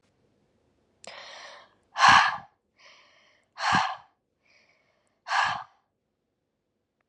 exhalation_length: 7.1 s
exhalation_amplitude: 19576
exhalation_signal_mean_std_ratio: 0.28
survey_phase: alpha (2021-03-01 to 2021-08-12)
age: 18-44
gender: Female
wearing_mask: 'No'
symptom_none: true
smoker_status: Never smoked
respiratory_condition_asthma: false
respiratory_condition_other: false
recruitment_source: REACT
submission_delay: 1 day
covid_test_result: Negative
covid_test_method: RT-qPCR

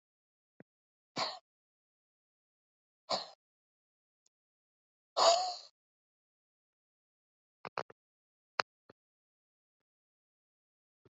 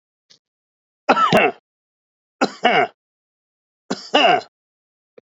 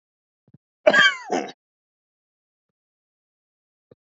exhalation_length: 11.2 s
exhalation_amplitude: 12291
exhalation_signal_mean_std_ratio: 0.18
three_cough_length: 5.3 s
three_cough_amplitude: 32767
three_cough_signal_mean_std_ratio: 0.36
cough_length: 4.0 s
cough_amplitude: 27434
cough_signal_mean_std_ratio: 0.24
survey_phase: beta (2021-08-13 to 2022-03-07)
age: 45-64
gender: Male
wearing_mask: 'Yes'
symptom_none: true
smoker_status: Ex-smoker
respiratory_condition_asthma: false
respiratory_condition_other: false
recruitment_source: REACT
submission_delay: 2 days
covid_test_result: Negative
covid_test_method: RT-qPCR
influenza_a_test_result: Negative
influenza_b_test_result: Negative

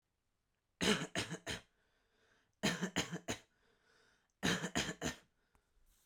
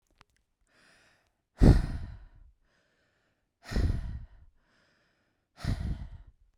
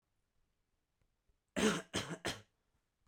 three_cough_length: 6.1 s
three_cough_amplitude: 3513
three_cough_signal_mean_std_ratio: 0.4
exhalation_length: 6.6 s
exhalation_amplitude: 14603
exhalation_signal_mean_std_ratio: 0.28
cough_length: 3.1 s
cough_amplitude: 3658
cough_signal_mean_std_ratio: 0.31
survey_phase: beta (2021-08-13 to 2022-03-07)
age: 18-44
gender: Male
wearing_mask: 'No'
symptom_none: true
smoker_status: Never smoked
respiratory_condition_asthma: false
respiratory_condition_other: false
recruitment_source: REACT
submission_delay: 3 days
covid_test_result: Negative
covid_test_method: RT-qPCR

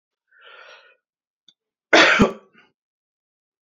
cough_length: 3.7 s
cough_amplitude: 28315
cough_signal_mean_std_ratio: 0.26
survey_phase: alpha (2021-03-01 to 2021-08-12)
age: 18-44
gender: Male
wearing_mask: 'No'
symptom_none: true
smoker_status: Ex-smoker
respiratory_condition_asthma: false
respiratory_condition_other: false
recruitment_source: REACT
submission_delay: 1 day
covid_test_result: Negative
covid_test_method: RT-qPCR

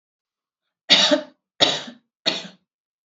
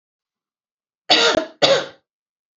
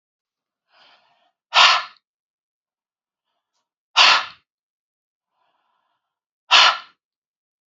three_cough_length: 3.1 s
three_cough_amplitude: 29795
three_cough_signal_mean_std_ratio: 0.34
cough_length: 2.6 s
cough_amplitude: 29636
cough_signal_mean_std_ratio: 0.37
exhalation_length: 7.7 s
exhalation_amplitude: 31803
exhalation_signal_mean_std_ratio: 0.25
survey_phase: alpha (2021-03-01 to 2021-08-12)
age: 45-64
gender: Female
wearing_mask: 'No'
symptom_none: true
smoker_status: Never smoked
respiratory_condition_asthma: false
respiratory_condition_other: false
recruitment_source: REACT
submission_delay: 2 days
covid_test_result: Negative
covid_test_method: RT-qPCR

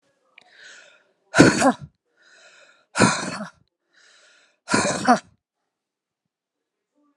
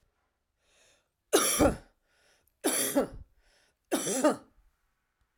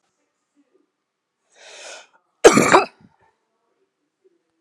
exhalation_length: 7.2 s
exhalation_amplitude: 32767
exhalation_signal_mean_std_ratio: 0.29
three_cough_length: 5.4 s
three_cough_amplitude: 11669
three_cough_signal_mean_std_ratio: 0.38
cough_length: 4.6 s
cough_amplitude: 32768
cough_signal_mean_std_ratio: 0.21
survey_phase: alpha (2021-03-01 to 2021-08-12)
age: 45-64
gender: Female
wearing_mask: 'No'
symptom_none: true
smoker_status: Never smoked
respiratory_condition_asthma: false
respiratory_condition_other: false
recruitment_source: REACT
submission_delay: 2 days
covid_test_result: Negative
covid_test_method: RT-qPCR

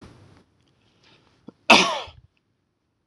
cough_length: 3.1 s
cough_amplitude: 26028
cough_signal_mean_std_ratio: 0.22
survey_phase: beta (2021-08-13 to 2022-03-07)
age: 45-64
gender: Male
wearing_mask: 'No'
symptom_cough_any: true
symptom_runny_or_blocked_nose: true
symptom_fatigue: true
symptom_headache: true
smoker_status: Ex-smoker
respiratory_condition_asthma: false
respiratory_condition_other: false
recruitment_source: Test and Trace
submission_delay: 1 day
covid_test_result: Positive
covid_test_method: RT-qPCR
covid_ct_value: 23.0
covid_ct_gene: ORF1ab gene
covid_ct_mean: 23.6
covid_viral_load: 18000 copies/ml
covid_viral_load_category: Low viral load (10K-1M copies/ml)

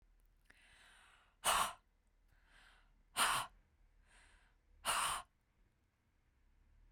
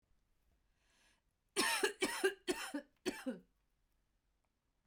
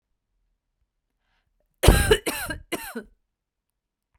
exhalation_length: 6.9 s
exhalation_amplitude: 2695
exhalation_signal_mean_std_ratio: 0.32
three_cough_length: 4.9 s
three_cough_amplitude: 3064
three_cough_signal_mean_std_ratio: 0.37
cough_length: 4.2 s
cough_amplitude: 31493
cough_signal_mean_std_ratio: 0.27
survey_phase: beta (2021-08-13 to 2022-03-07)
age: 45-64
gender: Female
wearing_mask: 'No'
symptom_none: true
smoker_status: Never smoked
respiratory_condition_asthma: false
respiratory_condition_other: false
recruitment_source: REACT
submission_delay: 1 day
covid_test_result: Negative
covid_test_method: RT-qPCR
influenza_a_test_result: Unknown/Void
influenza_b_test_result: Unknown/Void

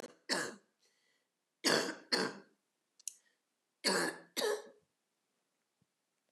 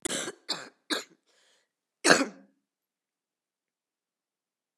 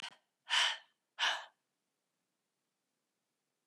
three_cough_length: 6.3 s
three_cough_amplitude: 4817
three_cough_signal_mean_std_ratio: 0.36
cough_length: 4.8 s
cough_amplitude: 28073
cough_signal_mean_std_ratio: 0.23
exhalation_length: 3.7 s
exhalation_amplitude: 3839
exhalation_signal_mean_std_ratio: 0.29
survey_phase: beta (2021-08-13 to 2022-03-07)
age: 45-64
gender: Female
wearing_mask: 'No'
symptom_cough_any: true
symptom_runny_or_blocked_nose: true
symptom_sore_throat: true
symptom_headache: true
smoker_status: Never smoked
respiratory_condition_asthma: false
respiratory_condition_other: false
recruitment_source: Test and Trace
submission_delay: 1 day
covid_test_result: Positive
covid_test_method: RT-qPCR
covid_ct_value: 28.9
covid_ct_gene: ORF1ab gene
covid_ct_mean: 29.7
covid_viral_load: 170 copies/ml
covid_viral_load_category: Minimal viral load (< 10K copies/ml)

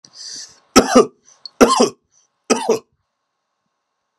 three_cough_length: 4.2 s
three_cough_amplitude: 32768
three_cough_signal_mean_std_ratio: 0.33
survey_phase: beta (2021-08-13 to 2022-03-07)
age: 45-64
gender: Male
wearing_mask: 'No'
symptom_none: true
smoker_status: Never smoked
respiratory_condition_asthma: false
respiratory_condition_other: false
recruitment_source: REACT
submission_delay: 5 days
covid_test_result: Negative
covid_test_method: RT-qPCR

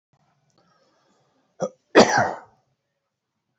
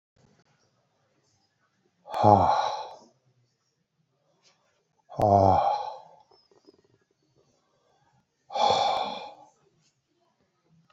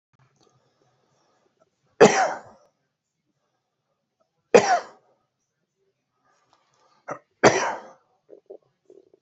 cough_length: 3.6 s
cough_amplitude: 28198
cough_signal_mean_std_ratio: 0.24
exhalation_length: 10.9 s
exhalation_amplitude: 20080
exhalation_signal_mean_std_ratio: 0.32
three_cough_length: 9.2 s
three_cough_amplitude: 27790
three_cough_signal_mean_std_ratio: 0.22
survey_phase: beta (2021-08-13 to 2022-03-07)
age: 45-64
gender: Male
wearing_mask: 'No'
symptom_none: true
smoker_status: Ex-smoker
respiratory_condition_asthma: false
respiratory_condition_other: false
recruitment_source: REACT
submission_delay: 2 days
covid_test_result: Negative
covid_test_method: RT-qPCR
influenza_a_test_result: Negative
influenza_b_test_result: Negative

